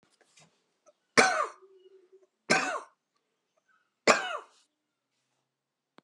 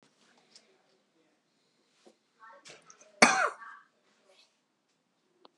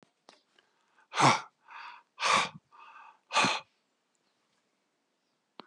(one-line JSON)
{"three_cough_length": "6.0 s", "three_cough_amplitude": 23362, "three_cough_signal_mean_std_ratio": 0.26, "cough_length": "5.6 s", "cough_amplitude": 19241, "cough_signal_mean_std_ratio": 0.18, "exhalation_length": "5.7 s", "exhalation_amplitude": 10014, "exhalation_signal_mean_std_ratio": 0.3, "survey_phase": "beta (2021-08-13 to 2022-03-07)", "age": "45-64", "gender": "Male", "wearing_mask": "No", "symptom_cough_any": true, "symptom_runny_or_blocked_nose": true, "symptom_sore_throat": true, "symptom_change_to_sense_of_smell_or_taste": true, "symptom_loss_of_taste": true, "symptom_onset": "4 days", "smoker_status": "Never smoked", "respiratory_condition_asthma": false, "respiratory_condition_other": false, "recruitment_source": "Test and Trace", "submission_delay": "2 days", "covid_test_result": "Positive", "covid_test_method": "RT-qPCR", "covid_ct_value": 15.5, "covid_ct_gene": "ORF1ab gene", "covid_ct_mean": 16.0, "covid_viral_load": "5600000 copies/ml", "covid_viral_load_category": "High viral load (>1M copies/ml)"}